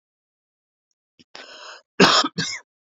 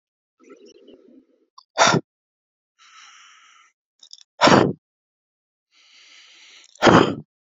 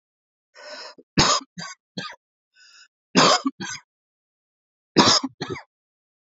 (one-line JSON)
{"cough_length": "3.0 s", "cough_amplitude": 29271, "cough_signal_mean_std_ratio": 0.29, "exhalation_length": "7.6 s", "exhalation_amplitude": 32404, "exhalation_signal_mean_std_ratio": 0.26, "three_cough_length": "6.3 s", "three_cough_amplitude": 28194, "three_cough_signal_mean_std_ratio": 0.32, "survey_phase": "beta (2021-08-13 to 2022-03-07)", "age": "45-64", "gender": "Male", "wearing_mask": "No", "symptom_runny_or_blocked_nose": true, "symptom_shortness_of_breath": true, "symptom_sore_throat": true, "symptom_fatigue": true, "smoker_status": "Never smoked", "respiratory_condition_asthma": false, "respiratory_condition_other": false, "recruitment_source": "Test and Trace", "submission_delay": "2 days", "covid_test_result": "Positive", "covid_test_method": "RT-qPCR", "covid_ct_value": 33.3, "covid_ct_gene": "ORF1ab gene", "covid_ct_mean": 34.1, "covid_viral_load": "6.3 copies/ml", "covid_viral_load_category": "Minimal viral load (< 10K copies/ml)"}